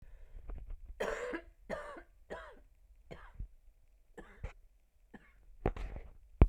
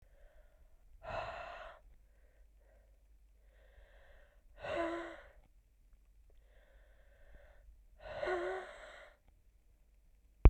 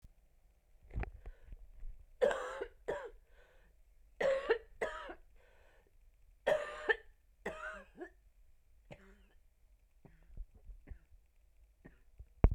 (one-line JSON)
{"cough_length": "6.5 s", "cough_amplitude": 13130, "cough_signal_mean_std_ratio": 0.32, "exhalation_length": "10.5 s", "exhalation_amplitude": 11933, "exhalation_signal_mean_std_ratio": 0.23, "three_cough_length": "12.5 s", "three_cough_amplitude": 10178, "three_cough_signal_mean_std_ratio": 0.33, "survey_phase": "alpha (2021-03-01 to 2021-08-12)", "age": "18-44", "gender": "Female", "wearing_mask": "No", "symptom_cough_any": true, "symptom_new_continuous_cough": true, "symptom_shortness_of_breath": true, "symptom_abdominal_pain": true, "symptom_fatigue": true, "symptom_fever_high_temperature": true, "symptom_headache": true, "symptom_onset": "3 days", "smoker_status": "Current smoker (1 to 10 cigarettes per day)", "respiratory_condition_asthma": false, "respiratory_condition_other": false, "recruitment_source": "Test and Trace", "submission_delay": "2 days", "covid_test_result": "Positive", "covid_test_method": "RT-qPCR", "covid_ct_value": 31.4, "covid_ct_gene": "N gene"}